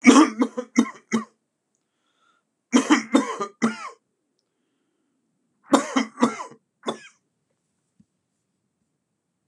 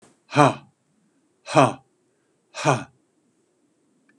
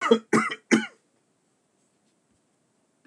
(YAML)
three_cough_length: 9.5 s
three_cough_amplitude: 32576
three_cough_signal_mean_std_ratio: 0.3
exhalation_length: 4.2 s
exhalation_amplitude: 31732
exhalation_signal_mean_std_ratio: 0.26
cough_length: 3.1 s
cough_amplitude: 18066
cough_signal_mean_std_ratio: 0.29
survey_phase: beta (2021-08-13 to 2022-03-07)
age: 65+
gender: Male
wearing_mask: 'No'
symptom_cough_any: true
smoker_status: Ex-smoker
respiratory_condition_asthma: true
respiratory_condition_other: false
recruitment_source: Test and Trace
submission_delay: 1 day
covid_test_result: Negative
covid_test_method: RT-qPCR